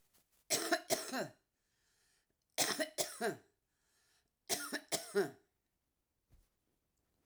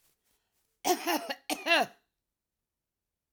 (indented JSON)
{
  "three_cough_length": "7.3 s",
  "three_cough_amplitude": 4098,
  "three_cough_signal_mean_std_ratio": 0.37,
  "cough_length": "3.3 s",
  "cough_amplitude": 9510,
  "cough_signal_mean_std_ratio": 0.34,
  "survey_phase": "alpha (2021-03-01 to 2021-08-12)",
  "age": "65+",
  "gender": "Female",
  "wearing_mask": "No",
  "symptom_none": true,
  "smoker_status": "Ex-smoker",
  "respiratory_condition_asthma": false,
  "respiratory_condition_other": false,
  "recruitment_source": "REACT",
  "submission_delay": "2 days",
  "covid_test_result": "Negative",
  "covid_test_method": "RT-qPCR"
}